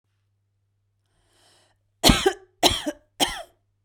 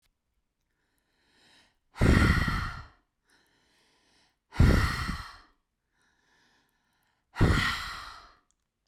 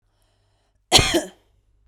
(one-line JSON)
{"three_cough_length": "3.8 s", "three_cough_amplitude": 32415, "three_cough_signal_mean_std_ratio": 0.28, "exhalation_length": "8.9 s", "exhalation_amplitude": 12365, "exhalation_signal_mean_std_ratio": 0.35, "cough_length": "1.9 s", "cough_amplitude": 32768, "cough_signal_mean_std_ratio": 0.29, "survey_phase": "beta (2021-08-13 to 2022-03-07)", "age": "18-44", "gender": "Female", "wearing_mask": "No", "symptom_none": true, "smoker_status": "Ex-smoker", "respiratory_condition_asthma": true, "respiratory_condition_other": false, "recruitment_source": "REACT", "submission_delay": "22 days", "covid_test_result": "Negative", "covid_test_method": "RT-qPCR"}